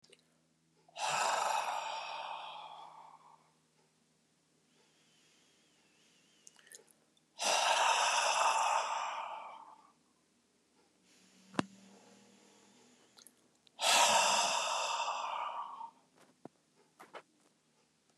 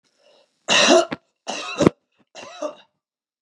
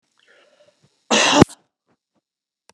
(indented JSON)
{
  "exhalation_length": "18.2 s",
  "exhalation_amplitude": 5926,
  "exhalation_signal_mean_std_ratio": 0.45,
  "three_cough_length": "3.4 s",
  "three_cough_amplitude": 32768,
  "three_cough_signal_mean_std_ratio": 0.35,
  "cough_length": "2.7 s",
  "cough_amplitude": 32768,
  "cough_signal_mean_std_ratio": 0.26,
  "survey_phase": "beta (2021-08-13 to 2022-03-07)",
  "age": "65+",
  "gender": "Female",
  "wearing_mask": "No",
  "symptom_none": true,
  "smoker_status": "Ex-smoker",
  "respiratory_condition_asthma": false,
  "respiratory_condition_other": false,
  "recruitment_source": "REACT",
  "submission_delay": "4 days",
  "covid_test_result": "Negative",
  "covid_test_method": "RT-qPCR",
  "influenza_a_test_result": "Negative",
  "influenza_b_test_result": "Negative"
}